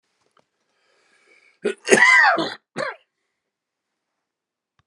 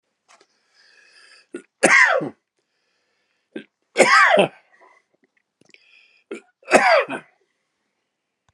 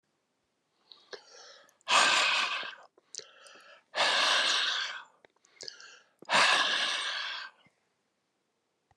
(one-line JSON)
{"cough_length": "4.9 s", "cough_amplitude": 32767, "cough_signal_mean_std_ratio": 0.31, "three_cough_length": "8.5 s", "three_cough_amplitude": 32767, "three_cough_signal_mean_std_ratio": 0.32, "exhalation_length": "9.0 s", "exhalation_amplitude": 9919, "exhalation_signal_mean_std_ratio": 0.48, "survey_phase": "beta (2021-08-13 to 2022-03-07)", "age": "65+", "gender": "Male", "wearing_mask": "No", "symptom_cough_any": true, "symptom_runny_or_blocked_nose": true, "symptom_fatigue": true, "symptom_other": true, "symptom_onset": "4 days", "smoker_status": "Never smoked", "respiratory_condition_asthma": false, "respiratory_condition_other": false, "recruitment_source": "Test and Trace", "submission_delay": "1 day", "covid_test_result": "Positive", "covid_test_method": "LAMP"}